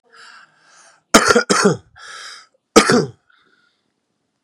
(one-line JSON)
{"cough_length": "4.4 s", "cough_amplitude": 32768, "cough_signal_mean_std_ratio": 0.34, "survey_phase": "beta (2021-08-13 to 2022-03-07)", "age": "45-64", "gender": "Male", "wearing_mask": "No", "symptom_none": true, "smoker_status": "Current smoker (e-cigarettes or vapes only)", "respiratory_condition_asthma": true, "respiratory_condition_other": false, "recruitment_source": "REACT", "submission_delay": "0 days", "covid_test_result": "Negative", "covid_test_method": "RT-qPCR", "influenza_a_test_result": "Negative", "influenza_b_test_result": "Negative"}